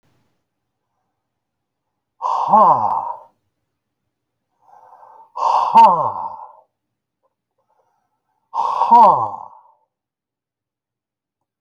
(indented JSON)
{
  "exhalation_length": "11.6 s",
  "exhalation_amplitude": 29384,
  "exhalation_signal_mean_std_ratio": 0.34,
  "survey_phase": "beta (2021-08-13 to 2022-03-07)",
  "age": "65+",
  "gender": "Male",
  "wearing_mask": "No",
  "symptom_fatigue": true,
  "smoker_status": "Never smoked",
  "respiratory_condition_asthma": false,
  "respiratory_condition_other": false,
  "recruitment_source": "REACT",
  "submission_delay": "2 days",
  "covid_test_result": "Negative",
  "covid_test_method": "RT-qPCR"
}